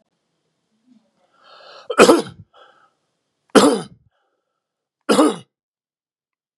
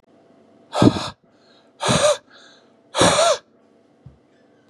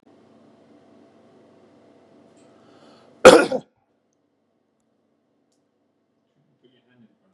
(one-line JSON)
{"three_cough_length": "6.6 s", "three_cough_amplitude": 32768, "three_cough_signal_mean_std_ratio": 0.26, "exhalation_length": "4.7 s", "exhalation_amplitude": 29304, "exhalation_signal_mean_std_ratio": 0.39, "cough_length": "7.3 s", "cough_amplitude": 32768, "cough_signal_mean_std_ratio": 0.14, "survey_phase": "beta (2021-08-13 to 2022-03-07)", "age": "65+", "gender": "Male", "wearing_mask": "No", "symptom_none": true, "smoker_status": "Never smoked", "respiratory_condition_asthma": false, "respiratory_condition_other": false, "recruitment_source": "REACT", "submission_delay": "2 days", "covid_test_result": "Negative", "covid_test_method": "RT-qPCR", "influenza_a_test_result": "Negative", "influenza_b_test_result": "Negative"}